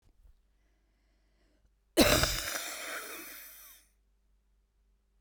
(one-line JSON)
{"cough_length": "5.2 s", "cough_amplitude": 12239, "cough_signal_mean_std_ratio": 0.31, "survey_phase": "beta (2021-08-13 to 2022-03-07)", "age": "18-44", "gender": "Female", "wearing_mask": "No", "symptom_cough_any": true, "symptom_new_continuous_cough": true, "symptom_sore_throat": true, "symptom_diarrhoea": true, "symptom_fatigue": true, "symptom_fever_high_temperature": true, "symptom_headache": true, "symptom_onset": "2 days", "smoker_status": "Current smoker (1 to 10 cigarettes per day)", "respiratory_condition_asthma": false, "respiratory_condition_other": false, "recruitment_source": "Test and Trace", "submission_delay": "1 day", "covid_test_result": "Negative", "covid_test_method": "RT-qPCR"}